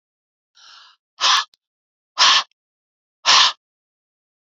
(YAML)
exhalation_length: 4.4 s
exhalation_amplitude: 31657
exhalation_signal_mean_std_ratio: 0.32
survey_phase: alpha (2021-03-01 to 2021-08-12)
age: 45-64
gender: Female
wearing_mask: 'No'
symptom_shortness_of_breath: true
symptom_fatigue: true
symptom_headache: true
symptom_change_to_sense_of_smell_or_taste: true
symptom_loss_of_taste: true
symptom_onset: 3 days
smoker_status: Ex-smoker
respiratory_condition_asthma: true
respiratory_condition_other: false
recruitment_source: Test and Trace
submission_delay: 2 days
covid_test_result: Positive
covid_test_method: RT-qPCR
covid_ct_value: 14.9
covid_ct_gene: S gene
covid_ct_mean: 15.0
covid_viral_load: 12000000 copies/ml
covid_viral_load_category: High viral load (>1M copies/ml)